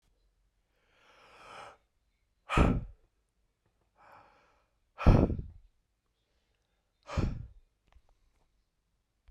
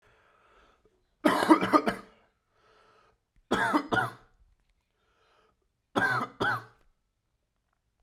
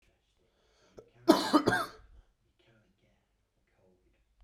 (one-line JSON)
{"exhalation_length": "9.3 s", "exhalation_amplitude": 13401, "exhalation_signal_mean_std_ratio": 0.23, "three_cough_length": "8.0 s", "three_cough_amplitude": 16293, "three_cough_signal_mean_std_ratio": 0.34, "cough_length": "4.4 s", "cough_amplitude": 14306, "cough_signal_mean_std_ratio": 0.25, "survey_phase": "beta (2021-08-13 to 2022-03-07)", "age": "18-44", "gender": "Male", "wearing_mask": "No", "symptom_cough_any": true, "symptom_runny_or_blocked_nose": true, "smoker_status": "Never smoked", "respiratory_condition_asthma": false, "respiratory_condition_other": false, "recruitment_source": "Test and Trace", "submission_delay": "1 day", "covid_test_result": "Positive", "covid_test_method": "RT-qPCR", "covid_ct_value": 21.1, "covid_ct_gene": "ORF1ab gene", "covid_ct_mean": 21.4, "covid_viral_load": "93000 copies/ml", "covid_viral_load_category": "Low viral load (10K-1M copies/ml)"}